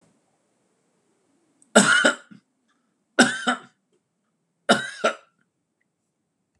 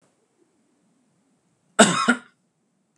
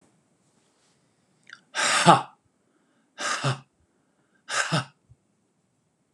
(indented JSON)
{
  "three_cough_length": "6.6 s",
  "three_cough_amplitude": 28298,
  "three_cough_signal_mean_std_ratio": 0.28,
  "cough_length": "3.0 s",
  "cough_amplitude": 32768,
  "cough_signal_mean_std_ratio": 0.24,
  "exhalation_length": "6.1 s",
  "exhalation_amplitude": 32548,
  "exhalation_signal_mean_std_ratio": 0.29,
  "survey_phase": "beta (2021-08-13 to 2022-03-07)",
  "age": "45-64",
  "gender": "Male",
  "wearing_mask": "No",
  "symptom_none": true,
  "smoker_status": "Ex-smoker",
  "respiratory_condition_asthma": false,
  "respiratory_condition_other": false,
  "recruitment_source": "REACT",
  "submission_delay": "1 day",
  "covid_test_result": "Negative",
  "covid_test_method": "RT-qPCR"
}